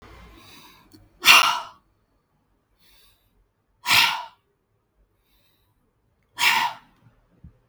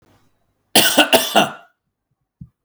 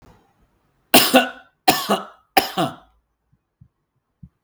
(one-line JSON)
{"exhalation_length": "7.7 s", "exhalation_amplitude": 32768, "exhalation_signal_mean_std_ratio": 0.28, "cough_length": "2.6 s", "cough_amplitude": 32768, "cough_signal_mean_std_ratio": 0.37, "three_cough_length": "4.4 s", "three_cough_amplitude": 32768, "three_cough_signal_mean_std_ratio": 0.31, "survey_phase": "beta (2021-08-13 to 2022-03-07)", "age": "45-64", "gender": "Male", "wearing_mask": "No", "symptom_none": true, "smoker_status": "Never smoked", "respiratory_condition_asthma": false, "respiratory_condition_other": false, "recruitment_source": "REACT", "submission_delay": "1 day", "covid_test_result": "Negative", "covid_test_method": "RT-qPCR"}